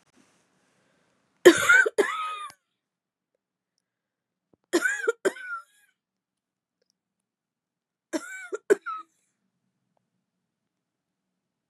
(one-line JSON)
{"three_cough_length": "11.7 s", "three_cough_amplitude": 29442, "three_cough_signal_mean_std_ratio": 0.23, "survey_phase": "beta (2021-08-13 to 2022-03-07)", "age": "45-64", "gender": "Female", "wearing_mask": "No", "symptom_cough_any": true, "symptom_new_continuous_cough": true, "symptom_shortness_of_breath": true, "symptom_abdominal_pain": true, "symptom_fatigue": true, "symptom_fever_high_temperature": true, "symptom_headache": true, "symptom_change_to_sense_of_smell_or_taste": true, "symptom_loss_of_taste": true, "symptom_onset": "5 days", "smoker_status": "Never smoked", "respiratory_condition_asthma": false, "respiratory_condition_other": false, "recruitment_source": "Test and Trace", "submission_delay": "2 days", "covid_test_result": "Positive", "covid_test_method": "ePCR"}